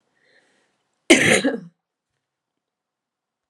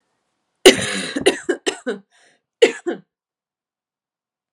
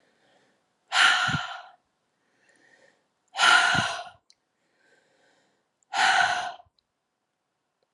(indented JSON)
{
  "cough_length": "3.5 s",
  "cough_amplitude": 32767,
  "cough_signal_mean_std_ratio": 0.26,
  "three_cough_length": "4.5 s",
  "three_cough_amplitude": 32768,
  "three_cough_signal_mean_std_ratio": 0.28,
  "exhalation_length": "7.9 s",
  "exhalation_amplitude": 16238,
  "exhalation_signal_mean_std_ratio": 0.37,
  "survey_phase": "beta (2021-08-13 to 2022-03-07)",
  "age": "18-44",
  "gender": "Female",
  "wearing_mask": "No",
  "symptom_runny_or_blocked_nose": true,
  "symptom_headache": true,
  "smoker_status": "Never smoked",
  "respiratory_condition_asthma": false,
  "respiratory_condition_other": false,
  "recruitment_source": "Test and Trace",
  "submission_delay": "1 day",
  "covid_test_result": "Positive",
  "covid_test_method": "LFT"
}